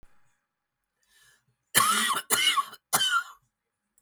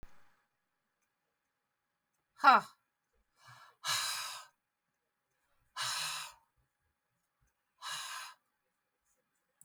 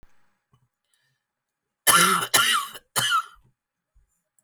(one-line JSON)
{"cough_length": "4.0 s", "cough_amplitude": 24869, "cough_signal_mean_std_ratio": 0.44, "exhalation_length": "9.6 s", "exhalation_amplitude": 9322, "exhalation_signal_mean_std_ratio": 0.23, "three_cough_length": "4.4 s", "three_cough_amplitude": 29251, "three_cough_signal_mean_std_ratio": 0.38, "survey_phase": "beta (2021-08-13 to 2022-03-07)", "age": "45-64", "gender": "Female", "wearing_mask": "No", "symptom_cough_any": true, "smoker_status": "Current smoker (11 or more cigarettes per day)", "respiratory_condition_asthma": false, "respiratory_condition_other": true, "recruitment_source": "REACT", "submission_delay": "4 days", "covid_test_result": "Negative", "covid_test_method": "RT-qPCR", "influenza_a_test_result": "Negative", "influenza_b_test_result": "Negative"}